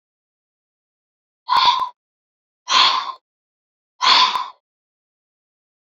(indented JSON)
{
  "exhalation_length": "5.9 s",
  "exhalation_amplitude": 31365,
  "exhalation_signal_mean_std_ratio": 0.35,
  "survey_phase": "beta (2021-08-13 to 2022-03-07)",
  "age": "18-44",
  "gender": "Female",
  "wearing_mask": "No",
  "symptom_cough_any": true,
  "symptom_runny_or_blocked_nose": true,
  "symptom_shortness_of_breath": true,
  "symptom_sore_throat": true,
  "symptom_fatigue": true,
  "symptom_headache": true,
  "symptom_onset": "3 days",
  "smoker_status": "Never smoked",
  "respiratory_condition_asthma": false,
  "respiratory_condition_other": false,
  "recruitment_source": "REACT",
  "submission_delay": "1 day",
  "covid_test_result": "Negative",
  "covid_test_method": "RT-qPCR",
  "influenza_a_test_result": "Positive",
  "influenza_a_ct_value": 34.0,
  "influenza_b_test_result": "Negative"
}